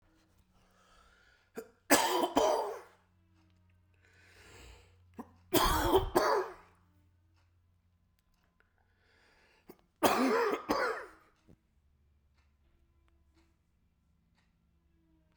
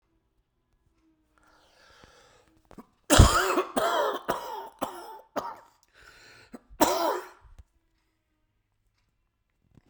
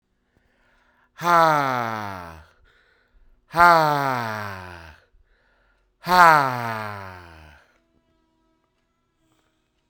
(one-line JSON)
{"three_cough_length": "15.4 s", "three_cough_amplitude": 10868, "three_cough_signal_mean_std_ratio": 0.34, "cough_length": "9.9 s", "cough_amplitude": 30419, "cough_signal_mean_std_ratio": 0.3, "exhalation_length": "9.9 s", "exhalation_amplitude": 32767, "exhalation_signal_mean_std_ratio": 0.34, "survey_phase": "beta (2021-08-13 to 2022-03-07)", "age": "45-64", "gender": "Male", "wearing_mask": "No", "symptom_cough_any": true, "symptom_fatigue": true, "symptom_onset": "3 days", "smoker_status": "Never smoked", "respiratory_condition_asthma": false, "respiratory_condition_other": false, "recruitment_source": "Test and Trace", "submission_delay": "2 days", "covid_test_result": "Positive", "covid_test_method": "RT-qPCR"}